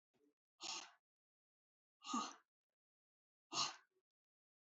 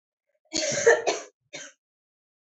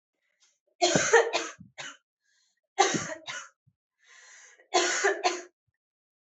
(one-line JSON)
{"exhalation_length": "4.8 s", "exhalation_amplitude": 1390, "exhalation_signal_mean_std_ratio": 0.29, "cough_length": "2.6 s", "cough_amplitude": 19115, "cough_signal_mean_std_ratio": 0.35, "three_cough_length": "6.3 s", "three_cough_amplitude": 14813, "three_cough_signal_mean_std_ratio": 0.39, "survey_phase": "alpha (2021-03-01 to 2021-08-12)", "age": "18-44", "gender": "Female", "wearing_mask": "No", "symptom_cough_any": true, "symptom_new_continuous_cough": true, "symptom_shortness_of_breath": true, "symptom_fatigue": true, "symptom_fever_high_temperature": true, "symptom_headache": true, "symptom_change_to_sense_of_smell_or_taste": true, "symptom_onset": "2 days", "smoker_status": "Ex-smoker", "respiratory_condition_asthma": false, "respiratory_condition_other": false, "recruitment_source": "Test and Trace", "submission_delay": "2 days", "covid_test_result": "Positive", "covid_test_method": "RT-qPCR", "covid_ct_value": 11.6, "covid_ct_gene": "N gene", "covid_ct_mean": 12.7, "covid_viral_load": "70000000 copies/ml", "covid_viral_load_category": "High viral load (>1M copies/ml)"}